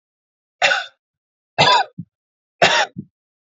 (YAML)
three_cough_length: 3.5 s
three_cough_amplitude: 32482
three_cough_signal_mean_std_ratio: 0.37
survey_phase: alpha (2021-03-01 to 2021-08-12)
age: 18-44
gender: Male
wearing_mask: 'No'
symptom_none: true
smoker_status: Never smoked
respiratory_condition_asthma: false
respiratory_condition_other: false
recruitment_source: REACT
submission_delay: 1 day
covid_test_result: Negative
covid_test_method: RT-qPCR